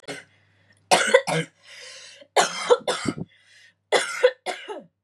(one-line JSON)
{"three_cough_length": "5.0 s", "three_cough_amplitude": 26669, "three_cough_signal_mean_std_ratio": 0.41, "survey_phase": "beta (2021-08-13 to 2022-03-07)", "age": "18-44", "gender": "Female", "wearing_mask": "No", "symptom_cough_any": true, "symptom_runny_or_blocked_nose": true, "symptom_onset": "7 days", "smoker_status": "Current smoker (1 to 10 cigarettes per day)", "respiratory_condition_asthma": false, "respiratory_condition_other": false, "recruitment_source": "REACT", "submission_delay": "2 days", "covid_test_result": "Negative", "covid_test_method": "RT-qPCR", "covid_ct_value": 47.0, "covid_ct_gene": "N gene"}